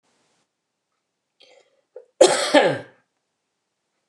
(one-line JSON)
{"cough_length": "4.1 s", "cough_amplitude": 29204, "cough_signal_mean_std_ratio": 0.26, "survey_phase": "beta (2021-08-13 to 2022-03-07)", "age": "65+", "gender": "Female", "wearing_mask": "No", "symptom_none": true, "smoker_status": "Never smoked", "respiratory_condition_asthma": false, "respiratory_condition_other": false, "recruitment_source": "REACT", "submission_delay": "12 days", "covid_test_result": "Negative", "covid_test_method": "RT-qPCR"}